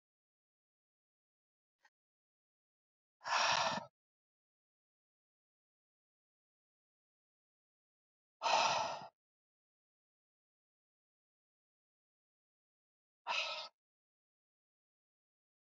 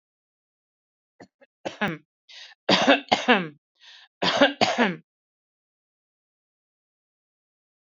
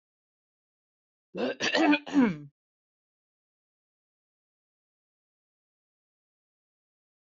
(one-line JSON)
{"exhalation_length": "15.7 s", "exhalation_amplitude": 3407, "exhalation_signal_mean_std_ratio": 0.23, "three_cough_length": "7.9 s", "three_cough_amplitude": 27640, "three_cough_signal_mean_std_ratio": 0.3, "cough_length": "7.3 s", "cough_amplitude": 10864, "cough_signal_mean_std_ratio": 0.25, "survey_phase": "beta (2021-08-13 to 2022-03-07)", "age": "45-64", "gender": "Female", "wearing_mask": "No", "symptom_none": true, "smoker_status": "Never smoked", "respiratory_condition_asthma": false, "respiratory_condition_other": false, "recruitment_source": "REACT", "submission_delay": "2 days", "covid_test_result": "Negative", "covid_test_method": "RT-qPCR", "influenza_a_test_result": "Unknown/Void", "influenza_b_test_result": "Unknown/Void"}